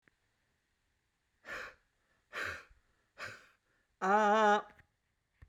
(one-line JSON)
{"exhalation_length": "5.5 s", "exhalation_amplitude": 4137, "exhalation_signal_mean_std_ratio": 0.33, "survey_phase": "beta (2021-08-13 to 2022-03-07)", "age": "65+", "gender": "Male", "wearing_mask": "No", "symptom_none": true, "smoker_status": "Never smoked", "respiratory_condition_asthma": false, "respiratory_condition_other": false, "recruitment_source": "REACT", "submission_delay": "1 day", "covid_test_result": "Negative", "covid_test_method": "RT-qPCR"}